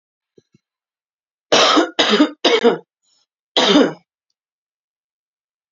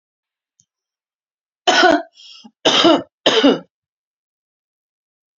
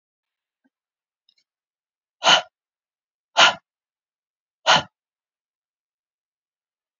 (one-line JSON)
{"cough_length": "5.7 s", "cough_amplitude": 32767, "cough_signal_mean_std_ratio": 0.39, "three_cough_length": "5.4 s", "three_cough_amplitude": 32455, "three_cough_signal_mean_std_ratio": 0.35, "exhalation_length": "7.0 s", "exhalation_amplitude": 30460, "exhalation_signal_mean_std_ratio": 0.2, "survey_phase": "alpha (2021-03-01 to 2021-08-12)", "age": "45-64", "gender": "Female", "wearing_mask": "No", "symptom_none": true, "smoker_status": "Current smoker (e-cigarettes or vapes only)", "respiratory_condition_asthma": false, "respiratory_condition_other": false, "recruitment_source": "REACT", "submission_delay": "2 days", "covid_test_result": "Negative", "covid_test_method": "RT-qPCR"}